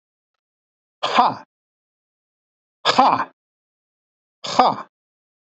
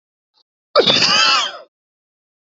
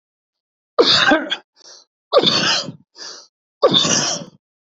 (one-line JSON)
{"exhalation_length": "5.5 s", "exhalation_amplitude": 26897, "exhalation_signal_mean_std_ratio": 0.29, "cough_length": "2.5 s", "cough_amplitude": 29394, "cough_signal_mean_std_ratio": 0.46, "three_cough_length": "4.6 s", "three_cough_amplitude": 29289, "three_cough_signal_mean_std_ratio": 0.49, "survey_phase": "beta (2021-08-13 to 2022-03-07)", "age": "45-64", "gender": "Male", "wearing_mask": "No", "symptom_headache": true, "symptom_onset": "12 days", "smoker_status": "Never smoked", "respiratory_condition_asthma": false, "respiratory_condition_other": false, "recruitment_source": "REACT", "submission_delay": "1 day", "covid_test_result": "Negative", "covid_test_method": "RT-qPCR", "influenza_a_test_result": "Negative", "influenza_b_test_result": "Negative"}